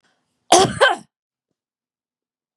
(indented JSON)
{
  "cough_length": "2.6 s",
  "cough_amplitude": 32767,
  "cough_signal_mean_std_ratio": 0.29,
  "survey_phase": "beta (2021-08-13 to 2022-03-07)",
  "age": "45-64",
  "gender": "Male",
  "wearing_mask": "No",
  "symptom_none": true,
  "smoker_status": "Ex-smoker",
  "respiratory_condition_asthma": false,
  "respiratory_condition_other": true,
  "recruitment_source": "Test and Trace",
  "submission_delay": "1 day",
  "covid_test_result": "Negative",
  "covid_test_method": "RT-qPCR"
}